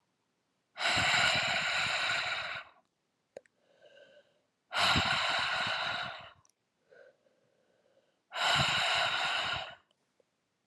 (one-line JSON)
{"exhalation_length": "10.7 s", "exhalation_amplitude": 6468, "exhalation_signal_mean_std_ratio": 0.58, "survey_phase": "beta (2021-08-13 to 2022-03-07)", "age": "18-44", "gender": "Female", "wearing_mask": "No", "symptom_cough_any": true, "symptom_runny_or_blocked_nose": true, "symptom_headache": true, "symptom_onset": "8 days", "smoker_status": "Never smoked", "respiratory_condition_asthma": false, "respiratory_condition_other": false, "recruitment_source": "Test and Trace", "submission_delay": "2 days", "covid_test_result": "Positive", "covid_test_method": "RT-qPCR"}